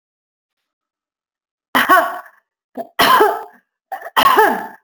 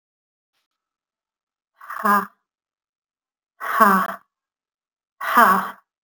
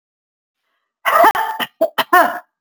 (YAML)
three_cough_length: 4.8 s
three_cough_amplitude: 30798
three_cough_signal_mean_std_ratio: 0.42
exhalation_length: 6.0 s
exhalation_amplitude: 28610
exhalation_signal_mean_std_ratio: 0.33
cough_length: 2.6 s
cough_amplitude: 32768
cough_signal_mean_std_ratio: 0.45
survey_phase: alpha (2021-03-01 to 2021-08-12)
age: 45-64
gender: Female
wearing_mask: 'No'
symptom_none: true
smoker_status: Ex-smoker
respiratory_condition_asthma: false
respiratory_condition_other: false
recruitment_source: REACT
submission_delay: 1 day
covid_test_result: Negative
covid_test_method: RT-qPCR